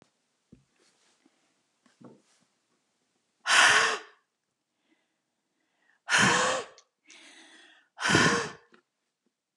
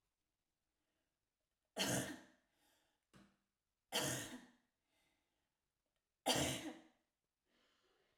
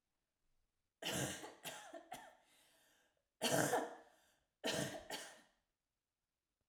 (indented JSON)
{
  "exhalation_length": "9.6 s",
  "exhalation_amplitude": 14540,
  "exhalation_signal_mean_std_ratio": 0.32,
  "three_cough_length": "8.2 s",
  "three_cough_amplitude": 2039,
  "three_cough_signal_mean_std_ratio": 0.31,
  "cough_length": "6.7 s",
  "cough_amplitude": 3078,
  "cough_signal_mean_std_ratio": 0.4,
  "survey_phase": "alpha (2021-03-01 to 2021-08-12)",
  "age": "45-64",
  "gender": "Female",
  "wearing_mask": "No",
  "symptom_none": true,
  "smoker_status": "Ex-smoker",
  "respiratory_condition_asthma": false,
  "respiratory_condition_other": false,
  "recruitment_source": "REACT",
  "submission_delay": "3 days",
  "covid_test_result": "Negative",
  "covid_test_method": "RT-qPCR"
}